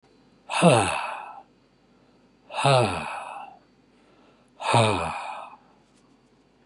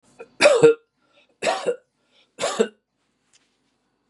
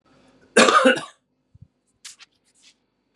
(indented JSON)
{
  "exhalation_length": "6.7 s",
  "exhalation_amplitude": 19475,
  "exhalation_signal_mean_std_ratio": 0.41,
  "three_cough_length": "4.1 s",
  "three_cough_amplitude": 26868,
  "three_cough_signal_mean_std_ratio": 0.33,
  "cough_length": "3.2 s",
  "cough_amplitude": 31271,
  "cough_signal_mean_std_ratio": 0.29,
  "survey_phase": "beta (2021-08-13 to 2022-03-07)",
  "age": "45-64",
  "gender": "Male",
  "wearing_mask": "No",
  "symptom_none": true,
  "smoker_status": "Ex-smoker",
  "respiratory_condition_asthma": false,
  "respiratory_condition_other": false,
  "recruitment_source": "REACT",
  "submission_delay": "3 days",
  "covid_test_result": "Negative",
  "covid_test_method": "RT-qPCR",
  "influenza_a_test_result": "Negative",
  "influenza_b_test_result": "Negative"
}